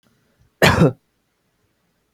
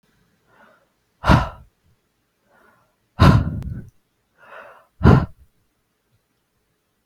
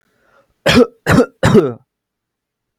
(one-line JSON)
{"cough_length": "2.1 s", "cough_amplitude": 32768, "cough_signal_mean_std_ratio": 0.29, "exhalation_length": "7.1 s", "exhalation_amplitude": 32768, "exhalation_signal_mean_std_ratio": 0.26, "three_cough_length": "2.8 s", "three_cough_amplitude": 32768, "three_cough_signal_mean_std_ratio": 0.4, "survey_phase": "beta (2021-08-13 to 2022-03-07)", "age": "18-44", "gender": "Male", "wearing_mask": "No", "symptom_none": true, "smoker_status": "Never smoked", "respiratory_condition_asthma": false, "respiratory_condition_other": false, "recruitment_source": "REACT", "submission_delay": "1 day", "covid_test_result": "Negative", "covid_test_method": "RT-qPCR", "influenza_a_test_result": "Negative", "influenza_b_test_result": "Negative"}